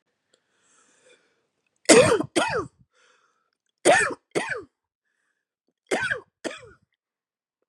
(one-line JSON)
{"three_cough_length": "7.7 s", "three_cough_amplitude": 32482, "three_cough_signal_mean_std_ratio": 0.3, "survey_phase": "beta (2021-08-13 to 2022-03-07)", "age": "45-64", "gender": "Female", "wearing_mask": "No", "symptom_cough_any": true, "symptom_fatigue": true, "symptom_headache": true, "symptom_onset": "6 days", "smoker_status": "Never smoked", "respiratory_condition_asthma": false, "respiratory_condition_other": false, "recruitment_source": "Test and Trace", "submission_delay": "1 day", "covid_test_result": "Positive", "covid_test_method": "RT-qPCR", "covid_ct_value": 21.4, "covid_ct_gene": "ORF1ab gene", "covid_ct_mean": 22.3, "covid_viral_load": "50000 copies/ml", "covid_viral_load_category": "Low viral load (10K-1M copies/ml)"}